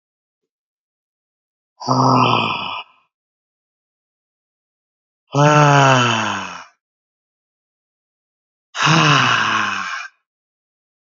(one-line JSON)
{"exhalation_length": "11.0 s", "exhalation_amplitude": 31241, "exhalation_signal_mean_std_ratio": 0.43, "survey_phase": "beta (2021-08-13 to 2022-03-07)", "age": "18-44", "gender": "Male", "wearing_mask": "No", "symptom_none": true, "smoker_status": "Never smoked", "respiratory_condition_asthma": false, "respiratory_condition_other": false, "recruitment_source": "Test and Trace", "submission_delay": "1 day", "covid_test_result": "Positive", "covid_test_method": "RT-qPCR", "covid_ct_value": 26.7, "covid_ct_gene": "ORF1ab gene", "covid_ct_mean": 27.1, "covid_viral_load": "1300 copies/ml", "covid_viral_load_category": "Minimal viral load (< 10K copies/ml)"}